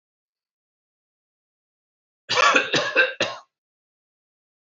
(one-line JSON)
{"cough_length": "4.7 s", "cough_amplitude": 24846, "cough_signal_mean_std_ratio": 0.32, "survey_phase": "beta (2021-08-13 to 2022-03-07)", "age": "65+", "gender": "Male", "wearing_mask": "No", "symptom_none": true, "symptom_onset": "2 days", "smoker_status": "Never smoked", "respiratory_condition_asthma": false, "respiratory_condition_other": false, "recruitment_source": "REACT", "submission_delay": "1 day", "covid_test_result": "Negative", "covid_test_method": "RT-qPCR"}